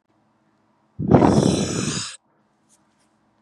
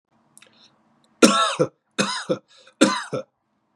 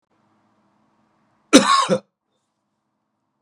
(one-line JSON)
{"exhalation_length": "3.4 s", "exhalation_amplitude": 32767, "exhalation_signal_mean_std_ratio": 0.4, "three_cough_length": "3.8 s", "three_cough_amplitude": 32768, "three_cough_signal_mean_std_ratio": 0.36, "cough_length": "3.4 s", "cough_amplitude": 32768, "cough_signal_mean_std_ratio": 0.25, "survey_phase": "beta (2021-08-13 to 2022-03-07)", "age": "18-44", "gender": "Male", "wearing_mask": "No", "symptom_cough_any": true, "symptom_runny_or_blocked_nose": true, "symptom_fatigue": true, "symptom_change_to_sense_of_smell_or_taste": true, "smoker_status": "Prefer not to say", "respiratory_condition_asthma": false, "respiratory_condition_other": false, "recruitment_source": "Test and Trace", "submission_delay": "1 day", "covid_test_result": "Positive", "covid_test_method": "RT-qPCR", "covid_ct_value": 35.5, "covid_ct_gene": "N gene"}